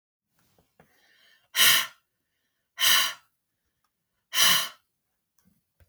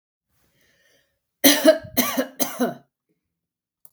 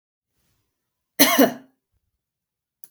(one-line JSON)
{"exhalation_length": "5.9 s", "exhalation_amplitude": 17625, "exhalation_signal_mean_std_ratio": 0.32, "three_cough_length": "3.9 s", "three_cough_amplitude": 32766, "three_cough_signal_mean_std_ratio": 0.32, "cough_length": "2.9 s", "cough_amplitude": 32768, "cough_signal_mean_std_ratio": 0.25, "survey_phase": "beta (2021-08-13 to 2022-03-07)", "age": "45-64", "gender": "Female", "wearing_mask": "No", "symptom_none": true, "smoker_status": "Never smoked", "respiratory_condition_asthma": false, "respiratory_condition_other": false, "recruitment_source": "REACT", "submission_delay": "2 days", "covid_test_result": "Negative", "covid_test_method": "RT-qPCR", "influenza_a_test_result": "Negative", "influenza_b_test_result": "Negative"}